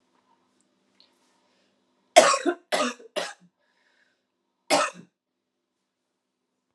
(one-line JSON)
{"three_cough_length": "6.7 s", "three_cough_amplitude": 32377, "three_cough_signal_mean_std_ratio": 0.24, "survey_phase": "beta (2021-08-13 to 2022-03-07)", "age": "45-64", "gender": "Female", "wearing_mask": "No", "symptom_cough_any": true, "symptom_runny_or_blocked_nose": true, "symptom_abdominal_pain": true, "symptom_fatigue": true, "symptom_headache": true, "symptom_other": true, "smoker_status": "Never smoked", "respiratory_condition_asthma": false, "respiratory_condition_other": false, "recruitment_source": "Test and Trace", "submission_delay": "2 days", "covid_test_result": "Positive", "covid_test_method": "RT-qPCR", "covid_ct_value": 29.3, "covid_ct_gene": "ORF1ab gene", "covid_ct_mean": 29.9, "covid_viral_load": "160 copies/ml", "covid_viral_load_category": "Minimal viral load (< 10K copies/ml)"}